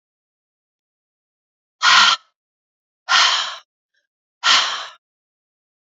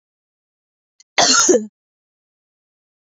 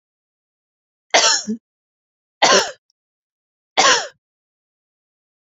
{"exhalation_length": "6.0 s", "exhalation_amplitude": 31287, "exhalation_signal_mean_std_ratio": 0.33, "cough_length": "3.1 s", "cough_amplitude": 29330, "cough_signal_mean_std_ratio": 0.31, "three_cough_length": "5.5 s", "three_cough_amplitude": 28368, "three_cough_signal_mean_std_ratio": 0.31, "survey_phase": "alpha (2021-03-01 to 2021-08-12)", "age": "45-64", "gender": "Female", "wearing_mask": "No", "symptom_cough_any": true, "symptom_shortness_of_breath": true, "symptom_headache": true, "symptom_onset": "2 days", "smoker_status": "Never smoked", "respiratory_condition_asthma": true, "respiratory_condition_other": false, "recruitment_source": "Test and Trace", "submission_delay": "1 day", "covid_test_result": "Positive", "covid_test_method": "RT-qPCR", "covid_ct_value": 15.3, "covid_ct_gene": "ORF1ab gene", "covid_ct_mean": 15.8, "covid_viral_load": "6500000 copies/ml", "covid_viral_load_category": "High viral load (>1M copies/ml)"}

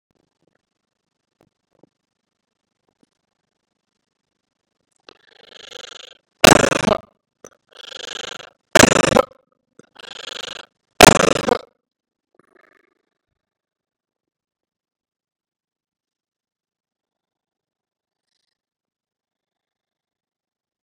{"three_cough_length": "20.8 s", "three_cough_amplitude": 32768, "three_cough_signal_mean_std_ratio": 0.16, "survey_phase": "beta (2021-08-13 to 2022-03-07)", "age": "65+", "gender": "Male", "wearing_mask": "No", "symptom_runny_or_blocked_nose": true, "smoker_status": "Ex-smoker", "respiratory_condition_asthma": false, "respiratory_condition_other": false, "recruitment_source": "REACT", "submission_delay": "2 days", "covid_test_result": "Negative", "covid_test_method": "RT-qPCR", "influenza_a_test_result": "Negative", "influenza_b_test_result": "Negative"}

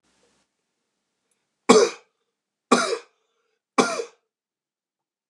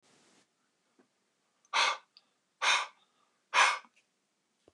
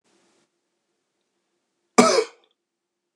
{"three_cough_length": "5.3 s", "three_cough_amplitude": 29204, "three_cough_signal_mean_std_ratio": 0.25, "exhalation_length": "4.7 s", "exhalation_amplitude": 8875, "exhalation_signal_mean_std_ratio": 0.3, "cough_length": "3.2 s", "cough_amplitude": 29204, "cough_signal_mean_std_ratio": 0.21, "survey_phase": "beta (2021-08-13 to 2022-03-07)", "age": "45-64", "gender": "Male", "wearing_mask": "Yes", "symptom_runny_or_blocked_nose": true, "smoker_status": "Never smoked", "respiratory_condition_asthma": false, "respiratory_condition_other": false, "recruitment_source": "REACT", "submission_delay": "1 day", "covid_test_result": "Negative", "covid_test_method": "RT-qPCR", "influenza_a_test_result": "Unknown/Void", "influenza_b_test_result": "Unknown/Void"}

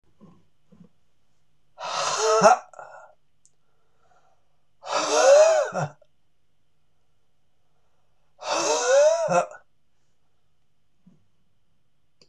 {"exhalation_length": "12.3 s", "exhalation_amplitude": 23710, "exhalation_signal_mean_std_ratio": 0.38, "survey_phase": "beta (2021-08-13 to 2022-03-07)", "age": "45-64", "gender": "Male", "wearing_mask": "No", "symptom_cough_any": true, "symptom_runny_or_blocked_nose": true, "symptom_sore_throat": true, "symptom_fatigue": true, "symptom_fever_high_temperature": true, "symptom_headache": true, "symptom_onset": "3 days", "smoker_status": "Never smoked", "respiratory_condition_asthma": false, "respiratory_condition_other": false, "recruitment_source": "Test and Trace", "submission_delay": "2 days", "covid_test_result": "Positive", "covid_test_method": "RT-qPCR", "covid_ct_value": 19.5, "covid_ct_gene": "ORF1ab gene", "covid_ct_mean": 20.6, "covid_viral_load": "170000 copies/ml", "covid_viral_load_category": "Low viral load (10K-1M copies/ml)"}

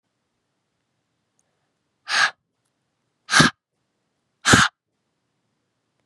{"exhalation_length": "6.1 s", "exhalation_amplitude": 32714, "exhalation_signal_mean_std_ratio": 0.24, "survey_phase": "beta (2021-08-13 to 2022-03-07)", "age": "18-44", "gender": "Female", "wearing_mask": "No", "symptom_runny_or_blocked_nose": true, "smoker_status": "Never smoked", "respiratory_condition_asthma": false, "respiratory_condition_other": false, "recruitment_source": "REACT", "submission_delay": "2 days", "covid_test_result": "Negative", "covid_test_method": "RT-qPCR", "influenza_a_test_result": "Negative", "influenza_b_test_result": "Negative"}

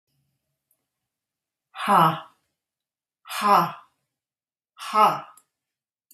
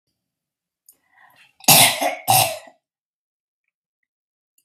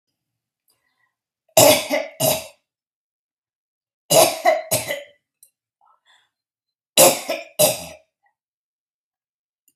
{"exhalation_length": "6.1 s", "exhalation_amplitude": 20019, "exhalation_signal_mean_std_ratio": 0.31, "cough_length": "4.6 s", "cough_amplitude": 32768, "cough_signal_mean_std_ratio": 0.29, "three_cough_length": "9.8 s", "three_cough_amplitude": 32768, "three_cough_signal_mean_std_ratio": 0.31, "survey_phase": "beta (2021-08-13 to 2022-03-07)", "age": "45-64", "gender": "Female", "wearing_mask": "No", "symptom_none": true, "smoker_status": "Ex-smoker", "respiratory_condition_asthma": false, "respiratory_condition_other": false, "recruitment_source": "REACT", "submission_delay": "1 day", "covid_test_result": "Negative", "covid_test_method": "RT-qPCR", "influenza_a_test_result": "Negative", "influenza_b_test_result": "Negative"}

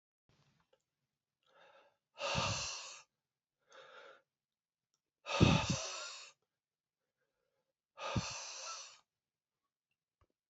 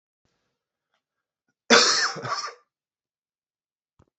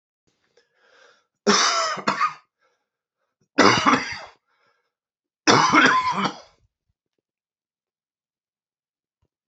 {"exhalation_length": "10.5 s", "exhalation_amplitude": 8048, "exhalation_signal_mean_std_ratio": 0.3, "cough_length": "4.2 s", "cough_amplitude": 27490, "cough_signal_mean_std_ratio": 0.27, "three_cough_length": "9.5 s", "three_cough_amplitude": 27465, "three_cough_signal_mean_std_ratio": 0.36, "survey_phase": "beta (2021-08-13 to 2022-03-07)", "age": "45-64", "gender": "Male", "wearing_mask": "No", "symptom_cough_any": true, "symptom_runny_or_blocked_nose": true, "symptom_sore_throat": true, "smoker_status": "Never smoked", "respiratory_condition_asthma": false, "respiratory_condition_other": false, "recruitment_source": "Test and Trace", "submission_delay": "1 day", "covid_test_result": "Positive", "covid_test_method": "LFT"}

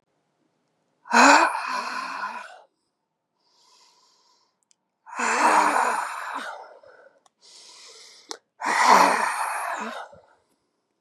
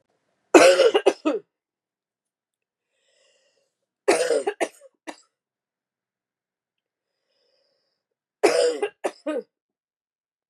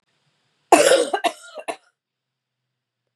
{"exhalation_length": "11.0 s", "exhalation_amplitude": 27744, "exhalation_signal_mean_std_ratio": 0.42, "three_cough_length": "10.5 s", "three_cough_amplitude": 32681, "three_cough_signal_mean_std_ratio": 0.28, "cough_length": "3.2 s", "cough_amplitude": 32767, "cough_signal_mean_std_ratio": 0.31, "survey_phase": "beta (2021-08-13 to 2022-03-07)", "age": "45-64", "gender": "Female", "wearing_mask": "No", "symptom_new_continuous_cough": true, "symptom_runny_or_blocked_nose": true, "symptom_sore_throat": true, "symptom_fever_high_temperature": true, "symptom_headache": true, "symptom_change_to_sense_of_smell_or_taste": true, "symptom_onset": "4 days", "smoker_status": "Never smoked", "respiratory_condition_asthma": false, "respiratory_condition_other": false, "recruitment_source": "Test and Trace", "submission_delay": "2 days", "covid_test_result": "Positive", "covid_test_method": "ePCR"}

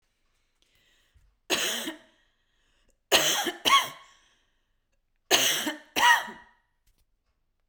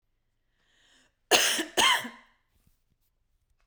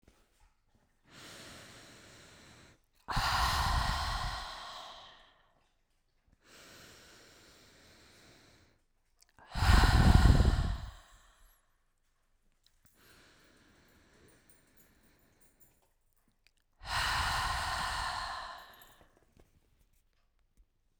{"three_cough_length": "7.7 s", "three_cough_amplitude": 16938, "three_cough_signal_mean_std_ratio": 0.36, "cough_length": "3.7 s", "cough_amplitude": 15172, "cough_signal_mean_std_ratio": 0.32, "exhalation_length": "21.0 s", "exhalation_amplitude": 10472, "exhalation_signal_mean_std_ratio": 0.34, "survey_phase": "beta (2021-08-13 to 2022-03-07)", "age": "18-44", "gender": "Female", "wearing_mask": "No", "symptom_fatigue": true, "symptom_onset": "5 days", "smoker_status": "Never smoked", "respiratory_condition_asthma": false, "respiratory_condition_other": false, "recruitment_source": "REACT", "submission_delay": "1 day", "covid_test_result": "Negative", "covid_test_method": "RT-qPCR"}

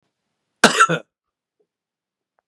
{"cough_length": "2.5 s", "cough_amplitude": 32768, "cough_signal_mean_std_ratio": 0.24, "survey_phase": "beta (2021-08-13 to 2022-03-07)", "age": "65+", "gender": "Male", "wearing_mask": "No", "symptom_none": true, "smoker_status": "Ex-smoker", "respiratory_condition_asthma": false, "respiratory_condition_other": false, "recruitment_source": "REACT", "submission_delay": "0 days", "covid_test_result": "Negative", "covid_test_method": "RT-qPCR"}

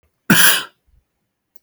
{"cough_length": "1.6 s", "cough_amplitude": 32768, "cough_signal_mean_std_ratio": 0.36, "survey_phase": "alpha (2021-03-01 to 2021-08-12)", "age": "45-64", "gender": "Male", "wearing_mask": "No", "symptom_none": true, "smoker_status": "Never smoked", "respiratory_condition_asthma": true, "respiratory_condition_other": false, "recruitment_source": "REACT", "submission_delay": "4 days", "covid_test_result": "Negative", "covid_test_method": "RT-qPCR"}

